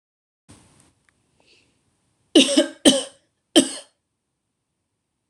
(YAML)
three_cough_length: 5.3 s
three_cough_amplitude: 26027
three_cough_signal_mean_std_ratio: 0.25
survey_phase: beta (2021-08-13 to 2022-03-07)
age: 18-44
gender: Female
wearing_mask: 'No'
symptom_runny_or_blocked_nose: true
symptom_fatigue: true
symptom_headache: true
symptom_other: true
symptom_onset: 3 days
smoker_status: Never smoked
respiratory_condition_asthma: false
respiratory_condition_other: false
recruitment_source: Test and Trace
submission_delay: 2 days
covid_test_result: Positive
covid_test_method: ePCR